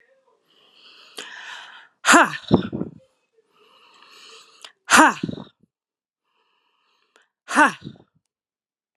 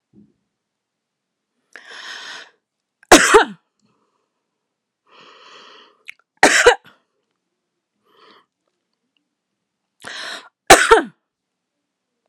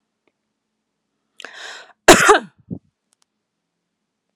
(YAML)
exhalation_length: 9.0 s
exhalation_amplitude: 32710
exhalation_signal_mean_std_ratio: 0.25
three_cough_length: 12.3 s
three_cough_amplitude: 32768
three_cough_signal_mean_std_ratio: 0.22
cough_length: 4.4 s
cough_amplitude: 32768
cough_signal_mean_std_ratio: 0.21
survey_phase: beta (2021-08-13 to 2022-03-07)
age: 45-64
gender: Female
wearing_mask: 'No'
symptom_cough_any: true
symptom_sore_throat: true
smoker_status: Ex-smoker
respiratory_condition_asthma: false
respiratory_condition_other: false
recruitment_source: Test and Trace
submission_delay: 1 day
covid_test_result: Positive
covid_test_method: RT-qPCR
covid_ct_value: 27.1
covid_ct_gene: ORF1ab gene
covid_ct_mean: 27.8
covid_viral_load: 740 copies/ml
covid_viral_load_category: Minimal viral load (< 10K copies/ml)